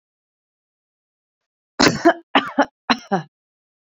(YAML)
three_cough_length: 3.8 s
three_cough_amplitude: 28259
three_cough_signal_mean_std_ratio: 0.29
survey_phase: beta (2021-08-13 to 2022-03-07)
age: 18-44
gender: Female
wearing_mask: 'No'
symptom_none: true
smoker_status: Ex-smoker
respiratory_condition_asthma: false
respiratory_condition_other: false
recruitment_source: REACT
submission_delay: 1 day
covid_test_result: Negative
covid_test_method: RT-qPCR